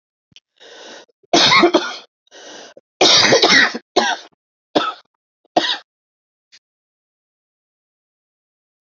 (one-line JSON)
{"three_cough_length": "8.9 s", "three_cough_amplitude": 32311, "three_cough_signal_mean_std_ratio": 0.36, "survey_phase": "alpha (2021-03-01 to 2021-08-12)", "age": "65+", "gender": "Female", "wearing_mask": "No", "symptom_cough_any": true, "symptom_shortness_of_breath": true, "smoker_status": "Never smoked", "respiratory_condition_asthma": false, "respiratory_condition_other": false, "recruitment_source": "REACT", "submission_delay": "2 days", "covid_test_result": "Negative", "covid_test_method": "RT-qPCR"}